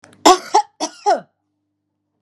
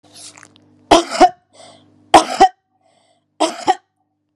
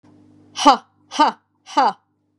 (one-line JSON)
{"cough_length": "2.2 s", "cough_amplitude": 32768, "cough_signal_mean_std_ratio": 0.33, "three_cough_length": "4.4 s", "three_cough_amplitude": 32768, "three_cough_signal_mean_std_ratio": 0.3, "exhalation_length": "2.4 s", "exhalation_amplitude": 32767, "exhalation_signal_mean_std_ratio": 0.35, "survey_phase": "beta (2021-08-13 to 2022-03-07)", "age": "45-64", "gender": "Female", "wearing_mask": "No", "symptom_none": true, "smoker_status": "Never smoked", "respiratory_condition_asthma": false, "respiratory_condition_other": false, "recruitment_source": "REACT", "submission_delay": "1 day", "covid_test_result": "Negative", "covid_test_method": "RT-qPCR"}